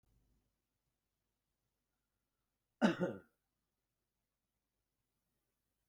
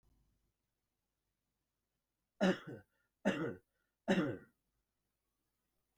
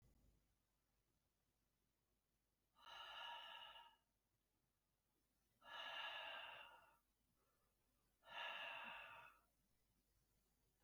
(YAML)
cough_length: 5.9 s
cough_amplitude: 4064
cough_signal_mean_std_ratio: 0.16
three_cough_length: 6.0 s
three_cough_amplitude: 3364
three_cough_signal_mean_std_ratio: 0.27
exhalation_length: 10.8 s
exhalation_amplitude: 334
exhalation_signal_mean_std_ratio: 0.48
survey_phase: beta (2021-08-13 to 2022-03-07)
age: 65+
gender: Male
wearing_mask: 'No'
symptom_none: true
smoker_status: Never smoked
respiratory_condition_asthma: false
respiratory_condition_other: false
recruitment_source: REACT
submission_delay: 2 days
covid_test_result: Negative
covid_test_method: RT-qPCR